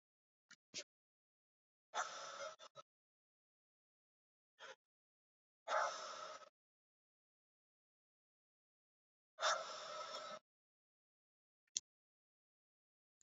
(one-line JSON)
{"exhalation_length": "13.2 s", "exhalation_amplitude": 3355, "exhalation_signal_mean_std_ratio": 0.29, "survey_phase": "beta (2021-08-13 to 2022-03-07)", "age": "18-44", "gender": "Male", "wearing_mask": "No", "symptom_cough_any": true, "symptom_new_continuous_cough": true, "symptom_runny_or_blocked_nose": true, "symptom_sore_throat": true, "symptom_fatigue": true, "symptom_fever_high_temperature": true, "symptom_headache": true, "symptom_change_to_sense_of_smell_or_taste": true, "symptom_loss_of_taste": true, "symptom_onset": "4 days", "smoker_status": "Ex-smoker", "respiratory_condition_asthma": false, "respiratory_condition_other": false, "recruitment_source": "Test and Trace", "submission_delay": "1 day", "covid_test_result": "Positive", "covid_test_method": "RT-qPCR"}